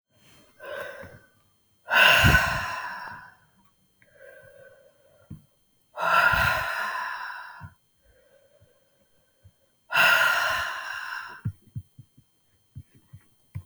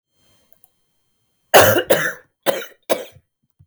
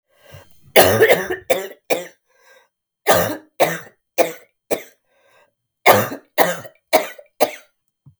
{"exhalation_length": "13.7 s", "exhalation_amplitude": 25013, "exhalation_signal_mean_std_ratio": 0.41, "cough_length": "3.7 s", "cough_amplitude": 32768, "cough_signal_mean_std_ratio": 0.33, "three_cough_length": "8.2 s", "three_cough_amplitude": 32768, "three_cough_signal_mean_std_ratio": 0.38, "survey_phase": "beta (2021-08-13 to 2022-03-07)", "age": "45-64", "gender": "Female", "wearing_mask": "No", "symptom_cough_any": true, "symptom_runny_or_blocked_nose": true, "symptom_sore_throat": true, "symptom_fatigue": true, "symptom_headache": true, "symptom_change_to_sense_of_smell_or_taste": true, "symptom_other": true, "symptom_onset": "2 days", "smoker_status": "Never smoked", "respiratory_condition_asthma": true, "respiratory_condition_other": false, "recruitment_source": "Test and Trace", "submission_delay": "1 day", "covid_test_result": "Negative", "covid_test_method": "ePCR"}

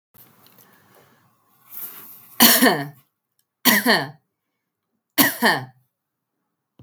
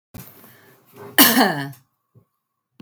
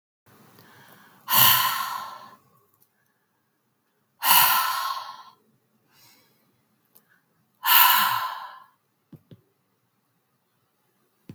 {"three_cough_length": "6.8 s", "three_cough_amplitude": 32768, "three_cough_signal_mean_std_ratio": 0.33, "cough_length": "2.8 s", "cough_amplitude": 32768, "cough_signal_mean_std_ratio": 0.31, "exhalation_length": "11.3 s", "exhalation_amplitude": 30818, "exhalation_signal_mean_std_ratio": 0.34, "survey_phase": "beta (2021-08-13 to 2022-03-07)", "age": "45-64", "gender": "Female", "wearing_mask": "No", "symptom_none": true, "symptom_onset": "7 days", "smoker_status": "Ex-smoker", "respiratory_condition_asthma": false, "respiratory_condition_other": false, "recruitment_source": "Test and Trace", "submission_delay": "1 day", "covid_test_result": "Positive", "covid_test_method": "RT-qPCR"}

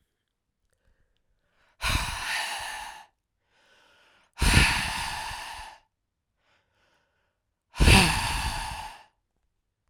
{"exhalation_length": "9.9 s", "exhalation_amplitude": 22665, "exhalation_signal_mean_std_ratio": 0.37, "survey_phase": "beta (2021-08-13 to 2022-03-07)", "age": "18-44", "gender": "Male", "wearing_mask": "No", "symptom_cough_any": true, "symptom_runny_or_blocked_nose": true, "symptom_shortness_of_breath": true, "symptom_sore_throat": true, "symptom_abdominal_pain": true, "symptom_fatigue": true, "symptom_fever_high_temperature": true, "symptom_headache": true, "symptom_change_to_sense_of_smell_or_taste": true, "symptom_onset": "3 days", "smoker_status": "Ex-smoker", "respiratory_condition_asthma": false, "respiratory_condition_other": false, "recruitment_source": "Test and Trace", "submission_delay": "2 days", "covid_test_result": "Positive", "covid_test_method": "RT-qPCR", "covid_ct_value": 15.8, "covid_ct_gene": "ORF1ab gene", "covid_ct_mean": 16.3, "covid_viral_load": "4600000 copies/ml", "covid_viral_load_category": "High viral load (>1M copies/ml)"}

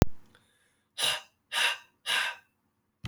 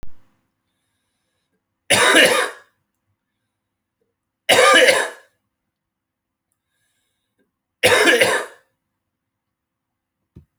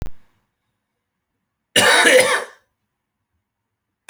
{"exhalation_length": "3.1 s", "exhalation_amplitude": 26011, "exhalation_signal_mean_std_ratio": 0.41, "three_cough_length": "10.6 s", "three_cough_amplitude": 32768, "three_cough_signal_mean_std_ratio": 0.33, "cough_length": "4.1 s", "cough_amplitude": 32540, "cough_signal_mean_std_ratio": 0.35, "survey_phase": "beta (2021-08-13 to 2022-03-07)", "age": "18-44", "gender": "Male", "wearing_mask": "No", "symptom_cough_any": true, "symptom_new_continuous_cough": true, "symptom_runny_or_blocked_nose": true, "symptom_sore_throat": true, "symptom_fatigue": true, "symptom_fever_high_temperature": true, "symptom_headache": true, "symptom_change_to_sense_of_smell_or_taste": true, "symptom_onset": "3 days", "smoker_status": "Never smoked", "respiratory_condition_asthma": false, "respiratory_condition_other": false, "recruitment_source": "Test and Trace", "submission_delay": "1 day", "covid_test_result": "Positive", "covid_test_method": "RT-qPCR", "covid_ct_value": 29.0, "covid_ct_gene": "ORF1ab gene", "covid_ct_mean": 29.8, "covid_viral_load": "160 copies/ml", "covid_viral_load_category": "Minimal viral load (< 10K copies/ml)"}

